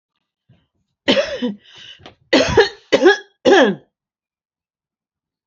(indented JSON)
{
  "cough_length": "5.5 s",
  "cough_amplitude": 32320,
  "cough_signal_mean_std_ratio": 0.37,
  "survey_phase": "alpha (2021-03-01 to 2021-08-12)",
  "age": "65+",
  "gender": "Female",
  "wearing_mask": "No",
  "symptom_none": true,
  "smoker_status": "Never smoked",
  "respiratory_condition_asthma": false,
  "respiratory_condition_other": false,
  "recruitment_source": "REACT",
  "submission_delay": "2 days",
  "covid_test_result": "Negative",
  "covid_test_method": "RT-qPCR"
}